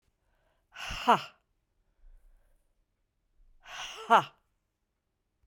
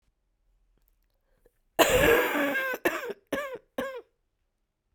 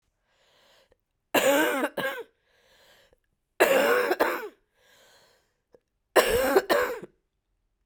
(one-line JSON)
{"exhalation_length": "5.5 s", "exhalation_amplitude": 11360, "exhalation_signal_mean_std_ratio": 0.21, "cough_length": "4.9 s", "cough_amplitude": 24875, "cough_signal_mean_std_ratio": 0.42, "three_cough_length": "7.9 s", "three_cough_amplitude": 20205, "three_cough_signal_mean_std_ratio": 0.43, "survey_phase": "beta (2021-08-13 to 2022-03-07)", "age": "45-64", "gender": "Female", "wearing_mask": "No", "symptom_cough_any": true, "symptom_new_continuous_cough": true, "symptom_runny_or_blocked_nose": true, "symptom_sore_throat": true, "symptom_fatigue": true, "symptom_headache": true, "symptom_change_to_sense_of_smell_or_taste": true, "symptom_loss_of_taste": true, "symptom_onset": "3 days", "smoker_status": "Never smoked", "respiratory_condition_asthma": true, "respiratory_condition_other": false, "recruitment_source": "Test and Trace", "submission_delay": "2 days", "covid_test_result": "Positive", "covid_test_method": "RT-qPCR", "covid_ct_value": 18.2, "covid_ct_gene": "ORF1ab gene", "covid_ct_mean": 18.4, "covid_viral_load": "930000 copies/ml", "covid_viral_load_category": "Low viral load (10K-1M copies/ml)"}